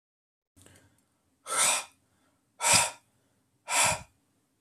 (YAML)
exhalation_length: 4.6 s
exhalation_amplitude: 13791
exhalation_signal_mean_std_ratio: 0.36
survey_phase: alpha (2021-03-01 to 2021-08-12)
age: 18-44
gender: Male
wearing_mask: 'No'
symptom_none: true
smoker_status: Ex-smoker
respiratory_condition_asthma: false
respiratory_condition_other: false
recruitment_source: REACT
submission_delay: 1 day
covid_test_result: Negative
covid_test_method: RT-qPCR